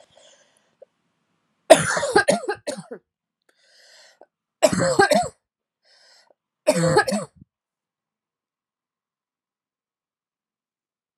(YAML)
three_cough_length: 11.2 s
three_cough_amplitude: 32768
three_cough_signal_mean_std_ratio: 0.29
survey_phase: alpha (2021-03-01 to 2021-08-12)
age: 45-64
gender: Female
wearing_mask: 'No'
symptom_cough_any: true
symptom_fatigue: true
symptom_change_to_sense_of_smell_or_taste: true
symptom_loss_of_taste: true
symptom_onset: 4 days
smoker_status: Never smoked
respiratory_condition_asthma: false
respiratory_condition_other: false
recruitment_source: Test and Trace
submission_delay: 2 days
covid_test_result: Positive
covid_test_method: RT-qPCR
covid_ct_value: 21.5
covid_ct_gene: ORF1ab gene
covid_ct_mean: 22.3
covid_viral_load: 48000 copies/ml
covid_viral_load_category: Low viral load (10K-1M copies/ml)